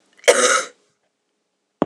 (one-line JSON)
{"cough_length": "1.9 s", "cough_amplitude": 26028, "cough_signal_mean_std_ratio": 0.35, "survey_phase": "alpha (2021-03-01 to 2021-08-12)", "age": "45-64", "gender": "Female", "wearing_mask": "No", "symptom_cough_any": true, "symptom_fatigue": true, "smoker_status": "Never smoked", "respiratory_condition_asthma": false, "respiratory_condition_other": true, "recruitment_source": "Test and Trace", "submission_delay": "1 day", "covid_test_result": "Positive", "covid_test_method": "RT-qPCR", "covid_ct_value": 33.2, "covid_ct_gene": "N gene"}